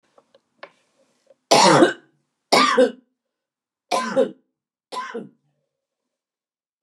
{
  "three_cough_length": "6.8 s",
  "three_cough_amplitude": 31907,
  "three_cough_signal_mean_std_ratio": 0.33,
  "survey_phase": "beta (2021-08-13 to 2022-03-07)",
  "age": "65+",
  "gender": "Female",
  "wearing_mask": "No",
  "symptom_none": true,
  "smoker_status": "Prefer not to say",
  "respiratory_condition_asthma": false,
  "respiratory_condition_other": false,
  "recruitment_source": "REACT",
  "submission_delay": "3 days",
  "covid_test_result": "Negative",
  "covid_test_method": "RT-qPCR",
  "influenza_a_test_result": "Negative",
  "influenza_b_test_result": "Negative"
}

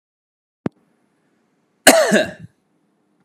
{
  "cough_length": "3.2 s",
  "cough_amplitude": 32768,
  "cough_signal_mean_std_ratio": 0.27,
  "survey_phase": "beta (2021-08-13 to 2022-03-07)",
  "age": "18-44",
  "wearing_mask": "No",
  "symptom_none": true,
  "smoker_status": "Ex-smoker",
  "respiratory_condition_asthma": true,
  "respiratory_condition_other": false,
  "recruitment_source": "Test and Trace",
  "submission_delay": "0 days",
  "covid_test_result": "Negative",
  "covid_test_method": "LFT"
}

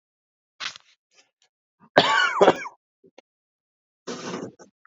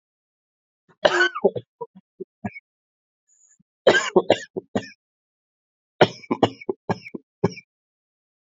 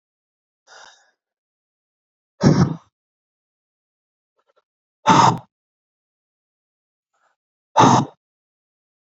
{
  "cough_length": "4.9 s",
  "cough_amplitude": 32768,
  "cough_signal_mean_std_ratio": 0.29,
  "three_cough_length": "8.5 s",
  "three_cough_amplitude": 27518,
  "three_cough_signal_mean_std_ratio": 0.27,
  "exhalation_length": "9.0 s",
  "exhalation_amplitude": 28050,
  "exhalation_signal_mean_std_ratio": 0.25,
  "survey_phase": "alpha (2021-03-01 to 2021-08-12)",
  "age": "18-44",
  "gender": "Male",
  "wearing_mask": "No",
  "symptom_cough_any": true,
  "symptom_shortness_of_breath": true,
  "symptom_abdominal_pain": true,
  "symptom_fatigue": true,
  "symptom_fever_high_temperature": true,
  "symptom_headache": true,
  "symptom_change_to_sense_of_smell_or_taste": true,
  "symptom_onset": "3 days",
  "smoker_status": "Never smoked",
  "respiratory_condition_asthma": true,
  "respiratory_condition_other": false,
  "recruitment_source": "Test and Trace",
  "submission_delay": "1 day",
  "covid_test_result": "Positive",
  "covid_test_method": "RT-qPCR"
}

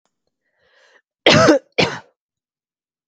{
  "cough_length": "3.1 s",
  "cough_amplitude": 32768,
  "cough_signal_mean_std_ratio": 0.31,
  "survey_phase": "beta (2021-08-13 to 2022-03-07)",
  "age": "18-44",
  "gender": "Female",
  "wearing_mask": "No",
  "symptom_none": true,
  "symptom_onset": "12 days",
  "smoker_status": "Never smoked",
  "respiratory_condition_asthma": false,
  "respiratory_condition_other": false,
  "recruitment_source": "REACT",
  "submission_delay": "2 days",
  "covid_test_result": "Negative",
  "covid_test_method": "RT-qPCR",
  "influenza_a_test_result": "Negative",
  "influenza_b_test_result": "Negative"
}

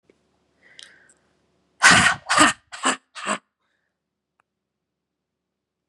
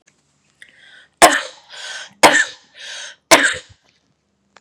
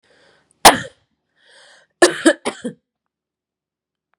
{
  "exhalation_length": "5.9 s",
  "exhalation_amplitude": 32757,
  "exhalation_signal_mean_std_ratio": 0.28,
  "three_cough_length": "4.6 s",
  "three_cough_amplitude": 32768,
  "three_cough_signal_mean_std_ratio": 0.31,
  "cough_length": "4.2 s",
  "cough_amplitude": 32768,
  "cough_signal_mean_std_ratio": 0.22,
  "survey_phase": "beta (2021-08-13 to 2022-03-07)",
  "age": "45-64",
  "gender": "Female",
  "wearing_mask": "No",
  "symptom_fatigue": true,
  "symptom_headache": true,
  "smoker_status": "Current smoker (e-cigarettes or vapes only)",
  "respiratory_condition_asthma": true,
  "respiratory_condition_other": false,
  "recruitment_source": "Test and Trace",
  "submission_delay": "2 days",
  "covid_test_result": "Positive",
  "covid_test_method": "RT-qPCR",
  "covid_ct_value": 22.4,
  "covid_ct_gene": "ORF1ab gene",
  "covid_ct_mean": 23.4,
  "covid_viral_load": "22000 copies/ml",
  "covid_viral_load_category": "Low viral load (10K-1M copies/ml)"
}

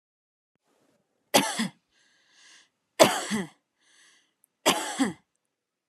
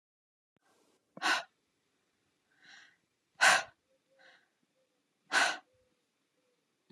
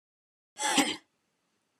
{
  "three_cough_length": "5.9 s",
  "three_cough_amplitude": 25800,
  "three_cough_signal_mean_std_ratio": 0.29,
  "exhalation_length": "6.9 s",
  "exhalation_amplitude": 8753,
  "exhalation_signal_mean_std_ratio": 0.24,
  "cough_length": "1.8 s",
  "cough_amplitude": 10348,
  "cough_signal_mean_std_ratio": 0.34,
  "survey_phase": "alpha (2021-03-01 to 2021-08-12)",
  "age": "18-44",
  "gender": "Female",
  "wearing_mask": "No",
  "symptom_none": true,
  "smoker_status": "Never smoked",
  "respiratory_condition_asthma": false,
  "respiratory_condition_other": false,
  "recruitment_source": "REACT",
  "submission_delay": "2 days",
  "covid_test_result": "Negative",
  "covid_test_method": "RT-qPCR"
}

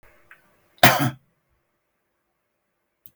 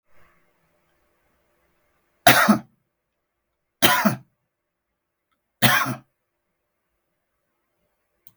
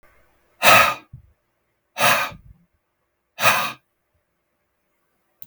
{
  "cough_length": "3.2 s",
  "cough_amplitude": 32768,
  "cough_signal_mean_std_ratio": 0.21,
  "three_cough_length": "8.4 s",
  "three_cough_amplitude": 32768,
  "three_cough_signal_mean_std_ratio": 0.25,
  "exhalation_length": "5.5 s",
  "exhalation_amplitude": 32768,
  "exhalation_signal_mean_std_ratio": 0.31,
  "survey_phase": "beta (2021-08-13 to 2022-03-07)",
  "age": "65+",
  "gender": "Male",
  "wearing_mask": "No",
  "symptom_none": true,
  "smoker_status": "Never smoked",
  "respiratory_condition_asthma": false,
  "respiratory_condition_other": false,
  "recruitment_source": "REACT",
  "submission_delay": "1 day",
  "covid_test_result": "Negative",
  "covid_test_method": "RT-qPCR"
}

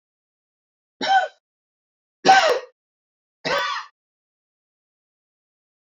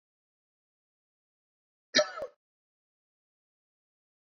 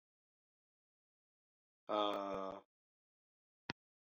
{
  "three_cough_length": "5.9 s",
  "three_cough_amplitude": 24976,
  "three_cough_signal_mean_std_ratio": 0.29,
  "cough_length": "4.3 s",
  "cough_amplitude": 10498,
  "cough_signal_mean_std_ratio": 0.15,
  "exhalation_length": "4.2 s",
  "exhalation_amplitude": 3229,
  "exhalation_signal_mean_std_ratio": 0.29,
  "survey_phase": "beta (2021-08-13 to 2022-03-07)",
  "age": "45-64",
  "gender": "Male",
  "wearing_mask": "No",
  "symptom_none": true,
  "smoker_status": "Never smoked",
  "respiratory_condition_asthma": false,
  "respiratory_condition_other": false,
  "recruitment_source": "REACT",
  "submission_delay": "3 days",
  "covid_test_result": "Negative",
  "covid_test_method": "RT-qPCR",
  "influenza_a_test_result": "Negative",
  "influenza_b_test_result": "Negative"
}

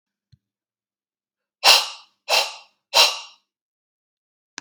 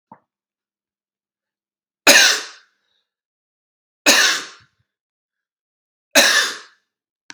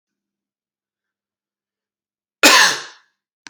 {
  "exhalation_length": "4.6 s",
  "exhalation_amplitude": 32768,
  "exhalation_signal_mean_std_ratio": 0.28,
  "three_cough_length": "7.3 s",
  "three_cough_amplitude": 32768,
  "three_cough_signal_mean_std_ratio": 0.29,
  "cough_length": "3.5 s",
  "cough_amplitude": 32768,
  "cough_signal_mean_std_ratio": 0.25,
  "survey_phase": "beta (2021-08-13 to 2022-03-07)",
  "age": "18-44",
  "gender": "Male",
  "wearing_mask": "No",
  "symptom_cough_any": true,
  "symptom_new_continuous_cough": true,
  "symptom_runny_or_blocked_nose": true,
  "symptom_sore_throat": true,
  "symptom_fatigue": true,
  "symptom_loss_of_taste": true,
  "symptom_onset": "3 days",
  "smoker_status": "Ex-smoker",
  "respiratory_condition_asthma": false,
  "respiratory_condition_other": false,
  "recruitment_source": "Test and Trace",
  "submission_delay": "2 days",
  "covid_test_result": "Positive",
  "covid_test_method": "RT-qPCR",
  "covid_ct_value": 16.2,
  "covid_ct_gene": "ORF1ab gene",
  "covid_ct_mean": 17.4,
  "covid_viral_load": "2000000 copies/ml",
  "covid_viral_load_category": "High viral load (>1M copies/ml)"
}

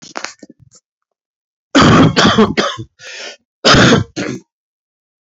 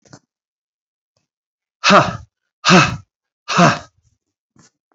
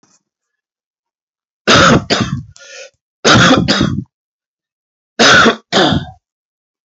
{
  "cough_length": "5.2 s",
  "cough_amplitude": 32768,
  "cough_signal_mean_std_ratio": 0.46,
  "exhalation_length": "4.9 s",
  "exhalation_amplitude": 30920,
  "exhalation_signal_mean_std_ratio": 0.31,
  "three_cough_length": "7.0 s",
  "three_cough_amplitude": 32768,
  "three_cough_signal_mean_std_ratio": 0.46,
  "survey_phase": "alpha (2021-03-01 to 2021-08-12)",
  "age": "45-64",
  "gender": "Male",
  "wearing_mask": "No",
  "symptom_cough_any": true,
  "symptom_fatigue": true,
  "symptom_headache": true,
  "symptom_change_to_sense_of_smell_or_taste": true,
  "symptom_onset": "4 days",
  "smoker_status": "Never smoked",
  "respiratory_condition_asthma": false,
  "respiratory_condition_other": false,
  "recruitment_source": "Test and Trace",
  "submission_delay": "1 day",
  "covid_test_result": "Positive",
  "covid_test_method": "RT-qPCR",
  "covid_ct_value": 25.0,
  "covid_ct_gene": "N gene"
}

